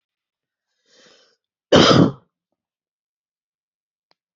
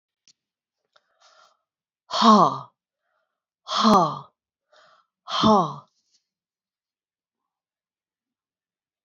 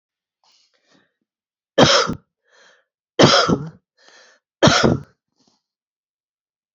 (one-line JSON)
{"cough_length": "4.4 s", "cough_amplitude": 28780, "cough_signal_mean_std_ratio": 0.24, "exhalation_length": "9.0 s", "exhalation_amplitude": 22627, "exhalation_signal_mean_std_ratio": 0.28, "three_cough_length": "6.7 s", "three_cough_amplitude": 32767, "three_cough_signal_mean_std_ratio": 0.32, "survey_phase": "beta (2021-08-13 to 2022-03-07)", "age": "65+", "gender": "Female", "wearing_mask": "No", "symptom_runny_or_blocked_nose": true, "symptom_fatigue": true, "smoker_status": "Never smoked", "respiratory_condition_asthma": false, "respiratory_condition_other": false, "recruitment_source": "Test and Trace", "submission_delay": "0 days", "covid_test_result": "Positive", "covid_test_method": "LFT"}